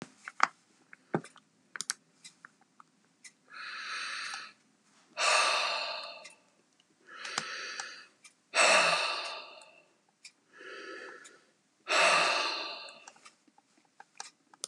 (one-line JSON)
{"exhalation_length": "14.7 s", "exhalation_amplitude": 20083, "exhalation_signal_mean_std_ratio": 0.4, "survey_phase": "beta (2021-08-13 to 2022-03-07)", "age": "65+", "gender": "Male", "wearing_mask": "No", "symptom_none": true, "smoker_status": "Ex-smoker", "respiratory_condition_asthma": false, "respiratory_condition_other": false, "recruitment_source": "REACT", "submission_delay": "2 days", "covid_test_result": "Negative", "covid_test_method": "RT-qPCR", "influenza_a_test_result": "Negative", "influenza_b_test_result": "Negative"}